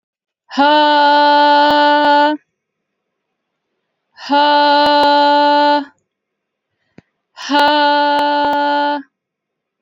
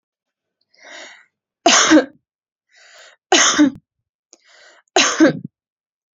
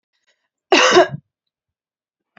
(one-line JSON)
{"exhalation_length": "9.8 s", "exhalation_amplitude": 29551, "exhalation_signal_mean_std_ratio": 0.69, "three_cough_length": "6.1 s", "three_cough_amplitude": 31290, "three_cough_signal_mean_std_ratio": 0.35, "cough_length": "2.4 s", "cough_amplitude": 29057, "cough_signal_mean_std_ratio": 0.32, "survey_phase": "beta (2021-08-13 to 2022-03-07)", "age": "18-44", "gender": "Female", "wearing_mask": "No", "symptom_runny_or_blocked_nose": true, "smoker_status": "Never smoked", "respiratory_condition_asthma": false, "respiratory_condition_other": false, "recruitment_source": "Test and Trace", "submission_delay": "1 day", "covid_test_result": "Positive", "covid_test_method": "RT-qPCR", "covid_ct_value": 23.2, "covid_ct_gene": "N gene", "covid_ct_mean": 23.2, "covid_viral_load": "25000 copies/ml", "covid_viral_load_category": "Low viral load (10K-1M copies/ml)"}